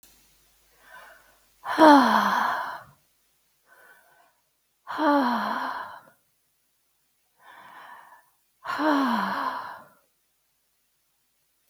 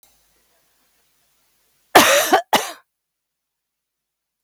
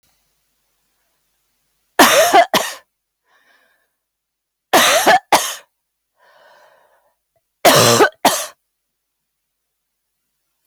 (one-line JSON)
{"exhalation_length": "11.7 s", "exhalation_amplitude": 24174, "exhalation_signal_mean_std_ratio": 0.36, "cough_length": "4.4 s", "cough_amplitude": 32768, "cough_signal_mean_std_ratio": 0.28, "three_cough_length": "10.7 s", "three_cough_amplitude": 32768, "three_cough_signal_mean_std_ratio": 0.34, "survey_phase": "beta (2021-08-13 to 2022-03-07)", "age": "65+", "gender": "Female", "wearing_mask": "No", "symptom_none": true, "smoker_status": "Never smoked", "respiratory_condition_asthma": false, "respiratory_condition_other": false, "recruitment_source": "REACT", "submission_delay": "4 days", "covid_test_result": "Negative", "covid_test_method": "RT-qPCR", "influenza_a_test_result": "Negative", "influenza_b_test_result": "Negative"}